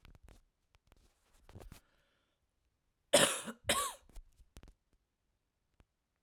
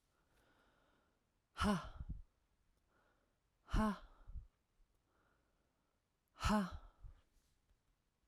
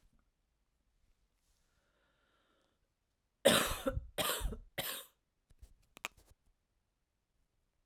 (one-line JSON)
{"cough_length": "6.2 s", "cough_amplitude": 9335, "cough_signal_mean_std_ratio": 0.23, "exhalation_length": "8.3 s", "exhalation_amplitude": 2078, "exhalation_signal_mean_std_ratio": 0.31, "three_cough_length": "7.9 s", "three_cough_amplitude": 7803, "three_cough_signal_mean_std_ratio": 0.26, "survey_phase": "beta (2021-08-13 to 2022-03-07)", "age": "18-44", "gender": "Female", "wearing_mask": "No", "symptom_cough_any": true, "symptom_runny_or_blocked_nose": true, "symptom_abdominal_pain": true, "symptom_fatigue": true, "symptom_fever_high_temperature": true, "symptom_headache": true, "symptom_other": true, "symptom_onset": "5 days", "smoker_status": "Ex-smoker", "respiratory_condition_asthma": false, "respiratory_condition_other": false, "recruitment_source": "Test and Trace", "submission_delay": "3 days", "covid_test_result": "Positive", "covid_test_method": "RT-qPCR", "covid_ct_value": 20.5, "covid_ct_gene": "ORF1ab gene"}